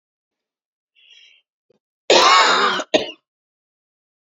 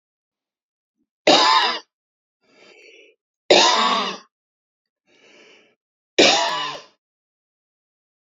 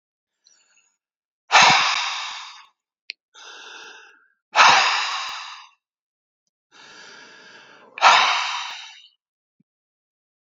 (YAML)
cough_length: 4.3 s
cough_amplitude: 29697
cough_signal_mean_std_ratio: 0.35
three_cough_length: 8.4 s
three_cough_amplitude: 29378
three_cough_signal_mean_std_ratio: 0.34
exhalation_length: 10.6 s
exhalation_amplitude: 32767
exhalation_signal_mean_std_ratio: 0.34
survey_phase: beta (2021-08-13 to 2022-03-07)
age: 45-64
gender: Female
wearing_mask: 'No'
symptom_runny_or_blocked_nose: true
smoker_status: Ex-smoker
respiratory_condition_asthma: false
respiratory_condition_other: false
recruitment_source: REACT
submission_delay: 1 day
covid_test_result: Negative
covid_test_method: RT-qPCR